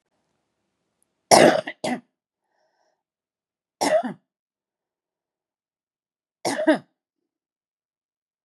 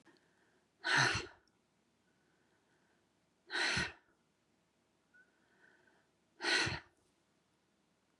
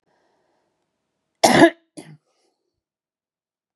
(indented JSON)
{
  "three_cough_length": "8.4 s",
  "three_cough_amplitude": 32768,
  "three_cough_signal_mean_std_ratio": 0.24,
  "exhalation_length": "8.2 s",
  "exhalation_amplitude": 4674,
  "exhalation_signal_mean_std_ratio": 0.31,
  "cough_length": "3.8 s",
  "cough_amplitude": 31103,
  "cough_signal_mean_std_ratio": 0.21,
  "survey_phase": "beta (2021-08-13 to 2022-03-07)",
  "age": "65+",
  "gender": "Female",
  "wearing_mask": "No",
  "symptom_none": true,
  "smoker_status": "Ex-smoker",
  "respiratory_condition_asthma": false,
  "respiratory_condition_other": false,
  "recruitment_source": "REACT",
  "submission_delay": "2 days",
  "covid_test_result": "Negative",
  "covid_test_method": "RT-qPCR",
  "influenza_a_test_result": "Negative",
  "influenza_b_test_result": "Negative"
}